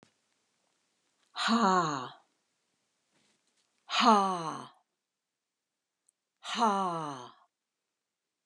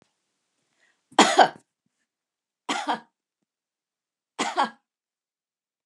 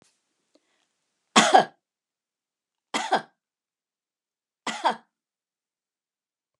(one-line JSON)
{"exhalation_length": "8.5 s", "exhalation_amplitude": 9475, "exhalation_signal_mean_std_ratio": 0.35, "three_cough_length": "5.9 s", "three_cough_amplitude": 29303, "three_cough_signal_mean_std_ratio": 0.24, "cough_length": "6.6 s", "cough_amplitude": 31266, "cough_signal_mean_std_ratio": 0.22, "survey_phase": "alpha (2021-03-01 to 2021-08-12)", "age": "65+", "gender": "Female", "wearing_mask": "No", "symptom_none": true, "smoker_status": "Never smoked", "respiratory_condition_asthma": false, "respiratory_condition_other": false, "recruitment_source": "REACT", "submission_delay": "1 day", "covid_test_result": "Negative", "covid_test_method": "RT-qPCR"}